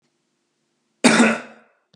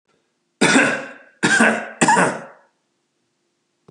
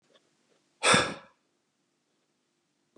{"cough_length": "2.0 s", "cough_amplitude": 32763, "cough_signal_mean_std_ratio": 0.33, "three_cough_length": "3.9 s", "three_cough_amplitude": 32078, "three_cough_signal_mean_std_ratio": 0.45, "exhalation_length": "3.0 s", "exhalation_amplitude": 13542, "exhalation_signal_mean_std_ratio": 0.24, "survey_phase": "beta (2021-08-13 to 2022-03-07)", "age": "45-64", "gender": "Male", "wearing_mask": "No", "symptom_none": true, "smoker_status": "Ex-smoker", "respiratory_condition_asthma": false, "respiratory_condition_other": false, "recruitment_source": "REACT", "submission_delay": "2 days", "covid_test_result": "Positive", "covid_test_method": "RT-qPCR", "covid_ct_value": 28.0, "covid_ct_gene": "E gene", "influenza_a_test_result": "Negative", "influenza_b_test_result": "Negative"}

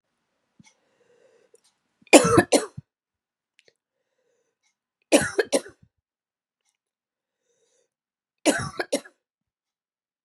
{"three_cough_length": "10.2 s", "three_cough_amplitude": 32768, "three_cough_signal_mean_std_ratio": 0.21, "survey_phase": "beta (2021-08-13 to 2022-03-07)", "age": "45-64", "gender": "Female", "wearing_mask": "No", "symptom_cough_any": true, "symptom_runny_or_blocked_nose": true, "symptom_shortness_of_breath": true, "symptom_sore_throat": true, "symptom_fatigue": true, "symptom_fever_high_temperature": true, "symptom_headache": true, "symptom_other": true, "symptom_onset": "4 days", "smoker_status": "Never smoked", "respiratory_condition_asthma": false, "respiratory_condition_other": false, "recruitment_source": "Test and Trace", "submission_delay": "2 days", "covid_test_result": "Positive", "covid_test_method": "RT-qPCR", "covid_ct_value": 18.4, "covid_ct_gene": "ORF1ab gene"}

